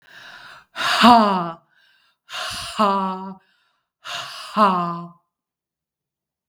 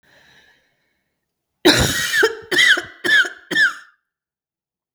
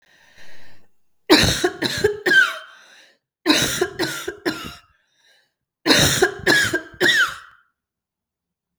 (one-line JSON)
{"exhalation_length": "6.5 s", "exhalation_amplitude": 32768, "exhalation_signal_mean_std_ratio": 0.41, "cough_length": "4.9 s", "cough_amplitude": 32768, "cough_signal_mean_std_ratio": 0.44, "three_cough_length": "8.8 s", "three_cough_amplitude": 32768, "three_cough_signal_mean_std_ratio": 0.49, "survey_phase": "beta (2021-08-13 to 2022-03-07)", "age": "45-64", "gender": "Female", "wearing_mask": "No", "symptom_none": true, "smoker_status": "Never smoked", "respiratory_condition_asthma": false, "respiratory_condition_other": false, "recruitment_source": "REACT", "submission_delay": "2 days", "covid_test_result": "Negative", "covid_test_method": "RT-qPCR", "influenza_a_test_result": "Negative", "influenza_b_test_result": "Negative"}